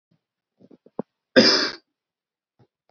cough_length: 2.9 s
cough_amplitude: 28592
cough_signal_mean_std_ratio: 0.26
survey_phase: beta (2021-08-13 to 2022-03-07)
age: 18-44
gender: Male
wearing_mask: 'No'
symptom_none: true
smoker_status: Never smoked
respiratory_condition_asthma: false
respiratory_condition_other: false
recruitment_source: REACT
submission_delay: 2 days
covid_test_result: Negative
covid_test_method: RT-qPCR
influenza_a_test_result: Negative
influenza_b_test_result: Negative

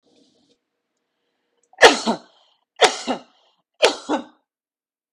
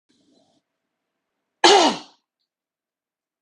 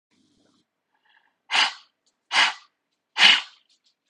three_cough_length: 5.1 s
three_cough_amplitude: 32768
three_cough_signal_mean_std_ratio: 0.25
cough_length: 3.4 s
cough_amplitude: 30346
cough_signal_mean_std_ratio: 0.24
exhalation_length: 4.1 s
exhalation_amplitude: 32767
exhalation_signal_mean_std_ratio: 0.29
survey_phase: beta (2021-08-13 to 2022-03-07)
age: 45-64
gender: Female
wearing_mask: 'No'
symptom_cough_any: true
smoker_status: Ex-smoker
respiratory_condition_asthma: false
respiratory_condition_other: false
recruitment_source: REACT
submission_delay: 2 days
covid_test_result: Negative
covid_test_method: RT-qPCR
influenza_a_test_result: Negative
influenza_b_test_result: Negative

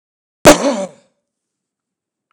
cough_length: 2.3 s
cough_amplitude: 32768
cough_signal_mean_std_ratio: 0.26
survey_phase: beta (2021-08-13 to 2022-03-07)
age: 65+
gender: Male
wearing_mask: 'No'
symptom_none: true
smoker_status: Never smoked
respiratory_condition_asthma: false
respiratory_condition_other: false
recruitment_source: REACT
submission_delay: 7 days
covid_test_result: Negative
covid_test_method: RT-qPCR
influenza_a_test_result: Negative
influenza_b_test_result: Negative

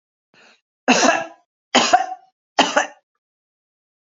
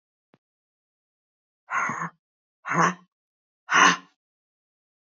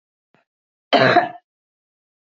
three_cough_length: 4.0 s
three_cough_amplitude: 32767
three_cough_signal_mean_std_ratio: 0.36
exhalation_length: 5.0 s
exhalation_amplitude: 20375
exhalation_signal_mean_std_ratio: 0.3
cough_length: 2.2 s
cough_amplitude: 27415
cough_signal_mean_std_ratio: 0.31
survey_phase: beta (2021-08-13 to 2022-03-07)
age: 45-64
gender: Female
wearing_mask: 'No'
symptom_none: true
smoker_status: Current smoker (e-cigarettes or vapes only)
respiratory_condition_asthma: false
respiratory_condition_other: false
recruitment_source: REACT
submission_delay: 1 day
covid_test_result: Negative
covid_test_method: RT-qPCR
influenza_a_test_result: Negative
influenza_b_test_result: Negative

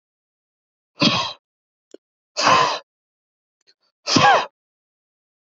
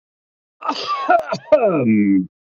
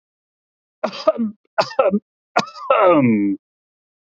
exhalation_length: 5.5 s
exhalation_amplitude: 26838
exhalation_signal_mean_std_ratio: 0.34
cough_length: 2.5 s
cough_amplitude: 27386
cough_signal_mean_std_ratio: 0.66
three_cough_length: 4.2 s
three_cough_amplitude: 27936
three_cough_signal_mean_std_ratio: 0.48
survey_phase: beta (2021-08-13 to 2022-03-07)
age: 45-64
gender: Male
wearing_mask: 'No'
symptom_none: true
smoker_status: Ex-smoker
respiratory_condition_asthma: false
respiratory_condition_other: false
recruitment_source: REACT
submission_delay: 1 day
covid_test_result: Negative
covid_test_method: RT-qPCR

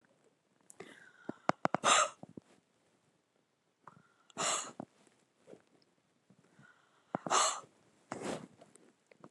exhalation_length: 9.3 s
exhalation_amplitude: 11857
exhalation_signal_mean_std_ratio: 0.27
survey_phase: beta (2021-08-13 to 2022-03-07)
age: 45-64
gender: Female
wearing_mask: 'No'
symptom_new_continuous_cough: true
symptom_runny_or_blocked_nose: true
symptom_sore_throat: true
symptom_diarrhoea: true
symptom_fatigue: true
symptom_fever_high_temperature: true
symptom_headache: true
symptom_onset: 8 days
smoker_status: Never smoked
respiratory_condition_asthma: false
respiratory_condition_other: false
recruitment_source: Test and Trace
submission_delay: 2 days
covid_test_result: Negative
covid_test_method: RT-qPCR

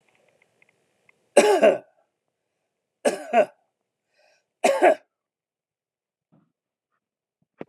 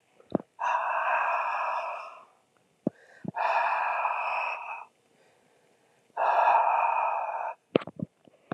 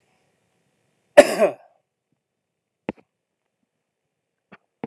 three_cough_length: 7.7 s
three_cough_amplitude: 29811
three_cough_signal_mean_std_ratio: 0.27
exhalation_length: 8.5 s
exhalation_amplitude: 22679
exhalation_signal_mean_std_ratio: 0.62
cough_length: 4.9 s
cough_amplitude: 32768
cough_signal_mean_std_ratio: 0.15
survey_phase: alpha (2021-03-01 to 2021-08-12)
age: 65+
gender: Male
wearing_mask: 'No'
symptom_none: true
smoker_status: Never smoked
respiratory_condition_asthma: false
respiratory_condition_other: false
recruitment_source: REACT
submission_delay: 1 day
covid_test_result: Negative
covid_test_method: RT-qPCR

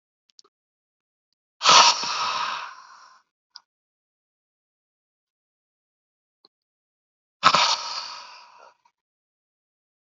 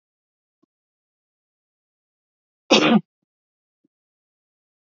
exhalation_length: 10.2 s
exhalation_amplitude: 29836
exhalation_signal_mean_std_ratio: 0.26
cough_length: 4.9 s
cough_amplitude: 28189
cough_signal_mean_std_ratio: 0.19
survey_phase: beta (2021-08-13 to 2022-03-07)
age: 65+
gender: Male
wearing_mask: 'No'
symptom_runny_or_blocked_nose: true
smoker_status: Ex-smoker
respiratory_condition_asthma: false
respiratory_condition_other: false
recruitment_source: Test and Trace
submission_delay: 2 days
covid_test_result: Positive
covid_test_method: RT-qPCR
covid_ct_value: 15.5
covid_ct_gene: ORF1ab gene
covid_ct_mean: 15.9
covid_viral_load: 6000000 copies/ml
covid_viral_load_category: High viral load (>1M copies/ml)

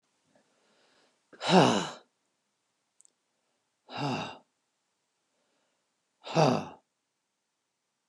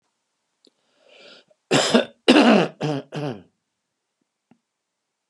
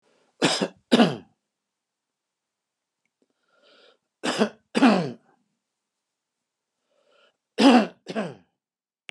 exhalation_length: 8.1 s
exhalation_amplitude: 15921
exhalation_signal_mean_std_ratio: 0.26
cough_length: 5.3 s
cough_amplitude: 31689
cough_signal_mean_std_ratio: 0.33
three_cough_length: 9.1 s
three_cough_amplitude: 24181
three_cough_signal_mean_std_ratio: 0.29
survey_phase: beta (2021-08-13 to 2022-03-07)
age: 65+
gender: Male
wearing_mask: 'No'
symptom_none: true
smoker_status: Ex-smoker
respiratory_condition_asthma: false
respiratory_condition_other: false
recruitment_source: REACT
submission_delay: 1 day
covid_test_result: Negative
covid_test_method: RT-qPCR
influenza_a_test_result: Unknown/Void
influenza_b_test_result: Unknown/Void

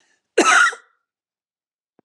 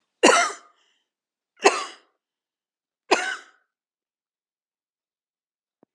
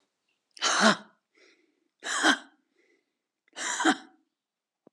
cough_length: 2.0 s
cough_amplitude: 25171
cough_signal_mean_std_ratio: 0.34
three_cough_length: 5.9 s
three_cough_amplitude: 29108
three_cough_signal_mean_std_ratio: 0.24
exhalation_length: 4.9 s
exhalation_amplitude: 17138
exhalation_signal_mean_std_ratio: 0.34
survey_phase: alpha (2021-03-01 to 2021-08-12)
age: 65+
gender: Female
wearing_mask: 'No'
symptom_none: true
smoker_status: Never smoked
respiratory_condition_asthma: false
respiratory_condition_other: false
recruitment_source: REACT
submission_delay: 2 days
covid_test_result: Negative
covid_test_method: RT-qPCR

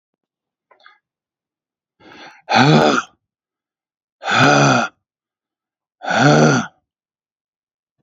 exhalation_length: 8.0 s
exhalation_amplitude: 29877
exhalation_signal_mean_std_ratio: 0.38
survey_phase: alpha (2021-03-01 to 2021-08-12)
age: 45-64
gender: Male
wearing_mask: 'No'
symptom_none: true
smoker_status: Ex-smoker
respiratory_condition_asthma: false
respiratory_condition_other: false
recruitment_source: REACT
submission_delay: 1 day
covid_test_result: Negative
covid_test_method: RT-qPCR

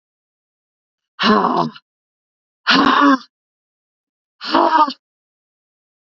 exhalation_length: 6.1 s
exhalation_amplitude: 27882
exhalation_signal_mean_std_ratio: 0.39
survey_phase: beta (2021-08-13 to 2022-03-07)
age: 45-64
gender: Female
wearing_mask: 'No'
symptom_sore_throat: true
symptom_fatigue: true
symptom_headache: true
symptom_change_to_sense_of_smell_or_taste: true
symptom_loss_of_taste: true
symptom_other: true
symptom_onset: 4 days
smoker_status: Ex-smoker
respiratory_condition_asthma: false
respiratory_condition_other: false
recruitment_source: Test and Trace
submission_delay: 1 day
covid_test_result: Positive
covid_test_method: RT-qPCR
covid_ct_value: 21.9
covid_ct_gene: ORF1ab gene
covid_ct_mean: 22.6
covid_viral_load: 40000 copies/ml
covid_viral_load_category: Low viral load (10K-1M copies/ml)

